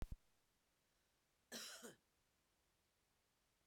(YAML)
cough_length: 3.7 s
cough_amplitude: 535
cough_signal_mean_std_ratio: 0.28
survey_phase: beta (2021-08-13 to 2022-03-07)
age: 45-64
gender: Female
wearing_mask: 'No'
symptom_cough_any: true
symptom_runny_or_blocked_nose: true
symptom_sore_throat: true
symptom_diarrhoea: true
symptom_fatigue: true
smoker_status: Ex-smoker
respiratory_condition_asthma: false
respiratory_condition_other: false
recruitment_source: Test and Trace
submission_delay: 1 day
covid_test_result: Positive
covid_test_method: RT-qPCR
covid_ct_value: 19.1
covid_ct_gene: ORF1ab gene